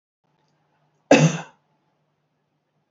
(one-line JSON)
{"cough_length": "2.9 s", "cough_amplitude": 27461, "cough_signal_mean_std_ratio": 0.23, "survey_phase": "beta (2021-08-13 to 2022-03-07)", "age": "65+", "gender": "Female", "wearing_mask": "No", "symptom_none": true, "smoker_status": "Never smoked", "respiratory_condition_asthma": false, "respiratory_condition_other": false, "recruitment_source": "REACT", "submission_delay": "1 day", "covid_test_result": "Negative", "covid_test_method": "RT-qPCR", "influenza_a_test_result": "Negative", "influenza_b_test_result": "Negative"}